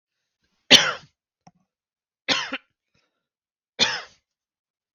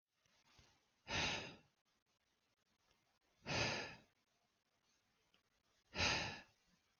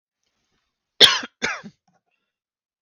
{
  "three_cough_length": "4.9 s",
  "three_cough_amplitude": 32768,
  "three_cough_signal_mean_std_ratio": 0.22,
  "exhalation_length": "7.0 s",
  "exhalation_amplitude": 1787,
  "exhalation_signal_mean_std_ratio": 0.35,
  "cough_length": "2.8 s",
  "cough_amplitude": 32768,
  "cough_signal_mean_std_ratio": 0.21,
  "survey_phase": "beta (2021-08-13 to 2022-03-07)",
  "age": "18-44",
  "gender": "Male",
  "wearing_mask": "No",
  "symptom_none": true,
  "smoker_status": "Never smoked",
  "respiratory_condition_asthma": false,
  "respiratory_condition_other": false,
  "recruitment_source": "REACT",
  "submission_delay": "0 days",
  "covid_test_result": "Negative",
  "covid_test_method": "RT-qPCR"
}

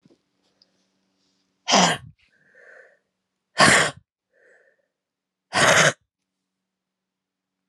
{
  "exhalation_length": "7.7 s",
  "exhalation_amplitude": 27069,
  "exhalation_signal_mean_std_ratio": 0.28,
  "survey_phase": "alpha (2021-03-01 to 2021-08-12)",
  "age": "45-64",
  "gender": "Female",
  "wearing_mask": "No",
  "symptom_cough_any": true,
  "symptom_shortness_of_breath": true,
  "symptom_fatigue": true,
  "symptom_headache": true,
  "symptom_change_to_sense_of_smell_or_taste": true,
  "symptom_loss_of_taste": true,
  "smoker_status": "Never smoked",
  "respiratory_condition_asthma": true,
  "respiratory_condition_other": false,
  "recruitment_source": "Test and Trace",
  "submission_delay": "1 day",
  "covid_test_result": "Positive",
  "covid_test_method": "RT-qPCR",
  "covid_ct_value": 18.8,
  "covid_ct_gene": "ORF1ab gene",
  "covid_ct_mean": 19.6,
  "covid_viral_load": "370000 copies/ml",
  "covid_viral_load_category": "Low viral load (10K-1M copies/ml)"
}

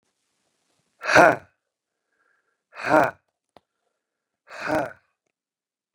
{
  "exhalation_length": "5.9 s",
  "exhalation_amplitude": 30435,
  "exhalation_signal_mean_std_ratio": 0.25,
  "survey_phase": "beta (2021-08-13 to 2022-03-07)",
  "age": "45-64",
  "gender": "Male",
  "wearing_mask": "No",
  "symptom_cough_any": true,
  "symptom_runny_or_blocked_nose": true,
  "symptom_sore_throat": true,
  "symptom_fatigue": true,
  "symptom_headache": true,
  "symptom_change_to_sense_of_smell_or_taste": true,
  "symptom_loss_of_taste": true,
  "symptom_onset": "5 days",
  "smoker_status": "Ex-smoker",
  "respiratory_condition_asthma": false,
  "respiratory_condition_other": false,
  "recruitment_source": "Test and Trace",
  "submission_delay": "1 day",
  "covid_test_result": "Positive",
  "covid_test_method": "RT-qPCR",
  "covid_ct_value": 15.8,
  "covid_ct_gene": "ORF1ab gene",
  "covid_ct_mean": 16.3,
  "covid_viral_load": "4400000 copies/ml",
  "covid_viral_load_category": "High viral load (>1M copies/ml)"
}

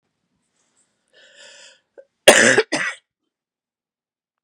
{
  "cough_length": "4.4 s",
  "cough_amplitude": 32768,
  "cough_signal_mean_std_ratio": 0.24,
  "survey_phase": "beta (2021-08-13 to 2022-03-07)",
  "age": "45-64",
  "gender": "Female",
  "wearing_mask": "No",
  "symptom_cough_any": true,
  "symptom_runny_or_blocked_nose": true,
  "symptom_shortness_of_breath": true,
  "symptom_sore_throat": true,
  "symptom_fatigue": true,
  "symptom_fever_high_temperature": true,
  "symptom_headache": true,
  "symptom_other": true,
  "symptom_onset": "3 days",
  "smoker_status": "Never smoked",
  "respiratory_condition_asthma": false,
  "respiratory_condition_other": false,
  "recruitment_source": "Test and Trace",
  "submission_delay": "2 days",
  "covid_test_result": "Positive",
  "covid_test_method": "RT-qPCR",
  "covid_ct_value": 15.2,
  "covid_ct_gene": "ORF1ab gene"
}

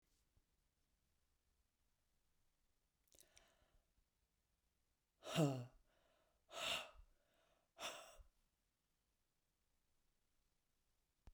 {
  "exhalation_length": "11.3 s",
  "exhalation_amplitude": 1627,
  "exhalation_signal_mean_std_ratio": 0.22,
  "survey_phase": "beta (2021-08-13 to 2022-03-07)",
  "age": "65+",
  "gender": "Female",
  "wearing_mask": "No",
  "symptom_other": true,
  "smoker_status": "Ex-smoker",
  "respiratory_condition_asthma": false,
  "respiratory_condition_other": false,
  "recruitment_source": "REACT",
  "submission_delay": "0 days",
  "covid_test_result": "Negative",
  "covid_test_method": "RT-qPCR"
}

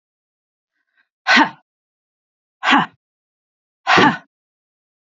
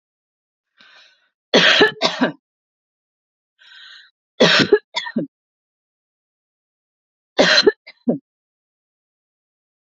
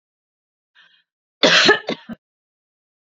{
  "exhalation_length": "5.1 s",
  "exhalation_amplitude": 30565,
  "exhalation_signal_mean_std_ratio": 0.29,
  "three_cough_length": "9.9 s",
  "three_cough_amplitude": 29435,
  "three_cough_signal_mean_std_ratio": 0.3,
  "cough_length": "3.1 s",
  "cough_amplitude": 32768,
  "cough_signal_mean_std_ratio": 0.29,
  "survey_phase": "beta (2021-08-13 to 2022-03-07)",
  "age": "18-44",
  "gender": "Female",
  "wearing_mask": "No",
  "symptom_none": true,
  "smoker_status": "Never smoked",
  "respiratory_condition_asthma": false,
  "respiratory_condition_other": false,
  "recruitment_source": "REACT",
  "submission_delay": "0 days",
  "covid_test_result": "Negative",
  "covid_test_method": "RT-qPCR",
  "influenza_a_test_result": "Negative",
  "influenza_b_test_result": "Negative"
}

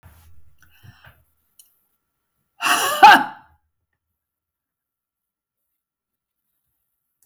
{
  "cough_length": "7.3 s",
  "cough_amplitude": 32768,
  "cough_signal_mean_std_ratio": 0.2,
  "survey_phase": "beta (2021-08-13 to 2022-03-07)",
  "age": "45-64",
  "gender": "Female",
  "wearing_mask": "No",
  "symptom_none": true,
  "smoker_status": "Never smoked",
  "respiratory_condition_asthma": false,
  "respiratory_condition_other": false,
  "recruitment_source": "REACT",
  "submission_delay": "1 day",
  "covid_test_result": "Negative",
  "covid_test_method": "RT-qPCR"
}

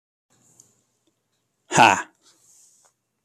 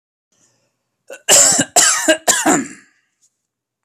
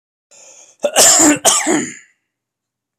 {
  "exhalation_length": "3.2 s",
  "exhalation_amplitude": 26097,
  "exhalation_signal_mean_std_ratio": 0.21,
  "three_cough_length": "3.8 s",
  "three_cough_amplitude": 32768,
  "three_cough_signal_mean_std_ratio": 0.44,
  "cough_length": "3.0 s",
  "cough_amplitude": 32768,
  "cough_signal_mean_std_ratio": 0.46,
  "survey_phase": "alpha (2021-03-01 to 2021-08-12)",
  "age": "18-44",
  "gender": "Male",
  "wearing_mask": "No",
  "symptom_shortness_of_breath": true,
  "symptom_abdominal_pain": true,
  "symptom_headache": true,
  "symptom_onset": "12 days",
  "smoker_status": "Current smoker (1 to 10 cigarettes per day)",
  "respiratory_condition_asthma": false,
  "respiratory_condition_other": false,
  "recruitment_source": "REACT",
  "submission_delay": "1 day",
  "covid_test_result": "Negative",
  "covid_test_method": "RT-qPCR"
}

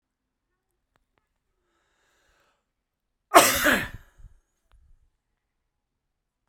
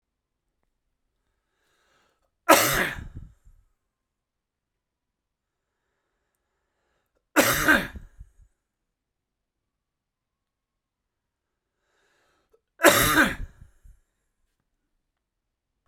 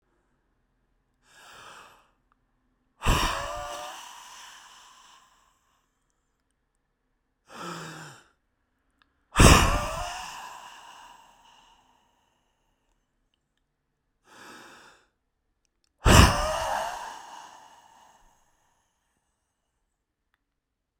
{
  "cough_length": "6.5 s",
  "cough_amplitude": 32767,
  "cough_signal_mean_std_ratio": 0.19,
  "three_cough_length": "15.9 s",
  "three_cough_amplitude": 32767,
  "three_cough_signal_mean_std_ratio": 0.23,
  "exhalation_length": "21.0 s",
  "exhalation_amplitude": 32640,
  "exhalation_signal_mean_std_ratio": 0.24,
  "survey_phase": "beta (2021-08-13 to 2022-03-07)",
  "age": "65+",
  "gender": "Male",
  "wearing_mask": "No",
  "symptom_shortness_of_breath": true,
  "symptom_abdominal_pain": true,
  "symptom_headache": true,
  "smoker_status": "Ex-smoker",
  "respiratory_condition_asthma": true,
  "respiratory_condition_other": false,
  "recruitment_source": "REACT",
  "submission_delay": "2 days",
  "covid_test_result": "Negative",
  "covid_test_method": "RT-qPCR"
}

